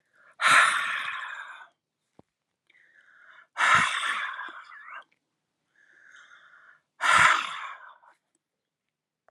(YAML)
exhalation_length: 9.3 s
exhalation_amplitude: 17164
exhalation_signal_mean_std_ratio: 0.38
survey_phase: beta (2021-08-13 to 2022-03-07)
age: 65+
gender: Female
wearing_mask: 'No'
symptom_none: true
smoker_status: Never smoked
respiratory_condition_asthma: false
respiratory_condition_other: false
recruitment_source: REACT
submission_delay: 1 day
covid_test_result: Negative
covid_test_method: RT-qPCR
influenza_a_test_result: Negative
influenza_b_test_result: Negative